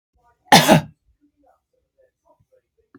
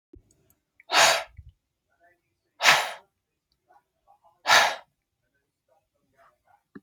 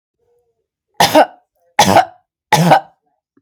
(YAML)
cough_length: 3.0 s
cough_amplitude: 32768
cough_signal_mean_std_ratio: 0.24
exhalation_length: 6.8 s
exhalation_amplitude: 25433
exhalation_signal_mean_std_ratio: 0.27
three_cough_length: 3.4 s
three_cough_amplitude: 32768
three_cough_signal_mean_std_ratio: 0.39
survey_phase: beta (2021-08-13 to 2022-03-07)
age: 45-64
gender: Female
wearing_mask: 'No'
symptom_sore_throat: true
symptom_fatigue: true
smoker_status: Never smoked
respiratory_condition_asthma: false
respiratory_condition_other: false
recruitment_source: Test and Trace
submission_delay: 1 day
covid_test_result: Negative
covid_test_method: RT-qPCR